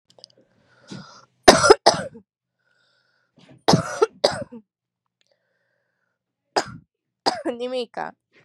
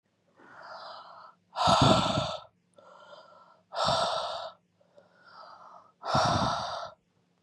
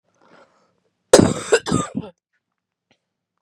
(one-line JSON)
{"three_cough_length": "8.4 s", "three_cough_amplitude": 32768, "three_cough_signal_mean_std_ratio": 0.26, "exhalation_length": "7.4 s", "exhalation_amplitude": 13498, "exhalation_signal_mean_std_ratio": 0.47, "cough_length": "3.4 s", "cough_amplitude": 32768, "cough_signal_mean_std_ratio": 0.27, "survey_phase": "beta (2021-08-13 to 2022-03-07)", "age": "18-44", "gender": "Female", "wearing_mask": "No", "symptom_cough_any": true, "symptom_runny_or_blocked_nose": true, "symptom_fatigue": true, "symptom_fever_high_temperature": true, "symptom_headache": true, "symptom_change_to_sense_of_smell_or_taste": true, "symptom_loss_of_taste": true, "smoker_status": "Current smoker (1 to 10 cigarettes per day)", "respiratory_condition_asthma": false, "respiratory_condition_other": false, "recruitment_source": "Test and Trace", "submission_delay": "2 days", "covid_test_result": "Positive", "covid_test_method": "ePCR"}